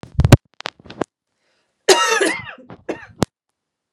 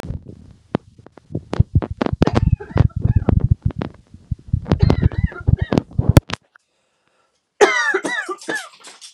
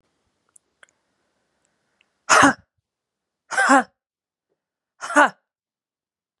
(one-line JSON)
{"cough_length": "3.9 s", "cough_amplitude": 32768, "cough_signal_mean_std_ratio": 0.3, "three_cough_length": "9.1 s", "three_cough_amplitude": 32768, "three_cough_signal_mean_std_ratio": 0.4, "exhalation_length": "6.4 s", "exhalation_amplitude": 30396, "exhalation_signal_mean_std_ratio": 0.25, "survey_phase": "beta (2021-08-13 to 2022-03-07)", "age": "18-44", "gender": "Female", "wearing_mask": "No", "symptom_cough_any": true, "symptom_runny_or_blocked_nose": true, "symptom_onset": "4 days", "smoker_status": "Ex-smoker", "respiratory_condition_asthma": true, "respiratory_condition_other": false, "recruitment_source": "Test and Trace", "submission_delay": "1 day", "covid_test_result": "Positive", "covid_test_method": "RT-qPCR", "covid_ct_value": 23.1, "covid_ct_gene": "ORF1ab gene", "covid_ct_mean": 24.7, "covid_viral_load": "8100 copies/ml", "covid_viral_load_category": "Minimal viral load (< 10K copies/ml)"}